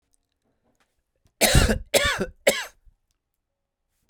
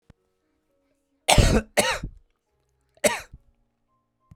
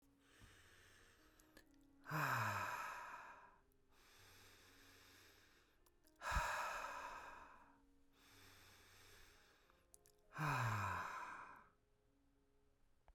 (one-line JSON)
{"three_cough_length": "4.1 s", "three_cough_amplitude": 26132, "three_cough_signal_mean_std_ratio": 0.34, "cough_length": "4.4 s", "cough_amplitude": 32767, "cough_signal_mean_std_ratio": 0.3, "exhalation_length": "13.1 s", "exhalation_amplitude": 1170, "exhalation_signal_mean_std_ratio": 0.47, "survey_phase": "beta (2021-08-13 to 2022-03-07)", "age": "45-64", "gender": "Male", "wearing_mask": "No", "symptom_none": true, "smoker_status": "Never smoked", "respiratory_condition_asthma": false, "respiratory_condition_other": false, "recruitment_source": "REACT", "submission_delay": "1 day", "covid_test_result": "Negative", "covid_test_method": "RT-qPCR"}